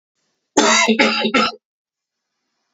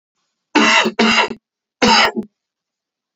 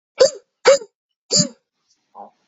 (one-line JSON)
{"cough_length": "2.7 s", "cough_amplitude": 30137, "cough_signal_mean_std_ratio": 0.48, "three_cough_length": "3.2 s", "three_cough_amplitude": 32767, "three_cough_signal_mean_std_ratio": 0.48, "exhalation_length": "2.5 s", "exhalation_amplitude": 32297, "exhalation_signal_mean_std_ratio": 0.32, "survey_phase": "alpha (2021-03-01 to 2021-08-12)", "age": "18-44", "gender": "Male", "wearing_mask": "No", "symptom_cough_any": true, "symptom_shortness_of_breath": true, "symptom_abdominal_pain": true, "symptom_diarrhoea": true, "symptom_fatigue": true, "symptom_headache": true, "symptom_onset": "4 days", "smoker_status": "Never smoked", "respiratory_condition_asthma": true, "respiratory_condition_other": false, "recruitment_source": "Test and Trace", "submission_delay": "2 days", "covid_test_result": "Positive", "covid_test_method": "RT-qPCR", "covid_ct_value": 17.2, "covid_ct_gene": "N gene", "covid_ct_mean": 17.3, "covid_viral_load": "2100000 copies/ml", "covid_viral_load_category": "High viral load (>1M copies/ml)"}